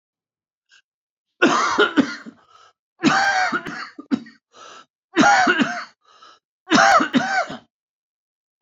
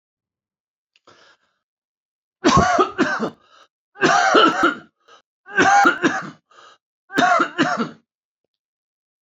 cough_length: 8.6 s
cough_amplitude: 27090
cough_signal_mean_std_ratio: 0.46
three_cough_length: 9.2 s
three_cough_amplitude: 26459
three_cough_signal_mean_std_ratio: 0.45
survey_phase: alpha (2021-03-01 to 2021-08-12)
age: 45-64
gender: Male
wearing_mask: 'No'
symptom_cough_any: true
symptom_new_continuous_cough: true
symptom_shortness_of_breath: true
symptom_fatigue: true
symptom_headache: true
symptom_onset: 4 days
smoker_status: Never smoked
respiratory_condition_asthma: false
respiratory_condition_other: false
recruitment_source: Test and Trace
submission_delay: 2 days
covid_test_method: RT-qPCR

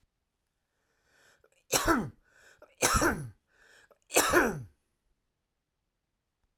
three_cough_length: 6.6 s
three_cough_amplitude: 11528
three_cough_signal_mean_std_ratio: 0.34
survey_phase: alpha (2021-03-01 to 2021-08-12)
age: 65+
gender: Male
wearing_mask: 'No'
symptom_none: true
smoker_status: Ex-smoker
respiratory_condition_asthma: false
respiratory_condition_other: false
recruitment_source: REACT
submission_delay: 1 day
covid_test_result: Negative
covid_test_method: RT-qPCR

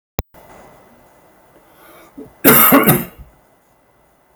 cough_length: 4.4 s
cough_amplitude: 32768
cough_signal_mean_std_ratio: 0.32
survey_phase: beta (2021-08-13 to 2022-03-07)
age: 45-64
gender: Male
wearing_mask: 'No'
symptom_none: true
smoker_status: Never smoked
respiratory_condition_asthma: false
respiratory_condition_other: false
recruitment_source: Test and Trace
submission_delay: 2 days
covid_test_result: Positive
covid_test_method: LFT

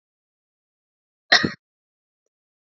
cough_length: 2.6 s
cough_amplitude: 29649
cough_signal_mean_std_ratio: 0.17
survey_phase: beta (2021-08-13 to 2022-03-07)
age: 45-64
gender: Female
wearing_mask: 'No'
symptom_none: true
smoker_status: Current smoker (1 to 10 cigarettes per day)
respiratory_condition_asthma: false
respiratory_condition_other: false
recruitment_source: REACT
submission_delay: 2 days
covid_test_result: Negative
covid_test_method: RT-qPCR
influenza_a_test_result: Unknown/Void
influenza_b_test_result: Unknown/Void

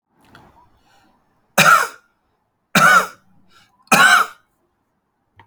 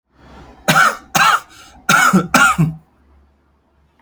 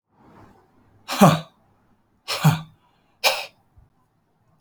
three_cough_length: 5.5 s
three_cough_amplitude: 32767
three_cough_signal_mean_std_ratio: 0.35
cough_length: 4.0 s
cough_amplitude: 32768
cough_signal_mean_std_ratio: 0.49
exhalation_length: 4.6 s
exhalation_amplitude: 32767
exhalation_signal_mean_std_ratio: 0.28
survey_phase: alpha (2021-03-01 to 2021-08-12)
age: 45-64
gender: Male
wearing_mask: 'No'
symptom_none: true
smoker_status: Ex-smoker
respiratory_condition_asthma: false
respiratory_condition_other: false
recruitment_source: REACT
submission_delay: 2 days
covid_test_result: Negative
covid_test_method: RT-qPCR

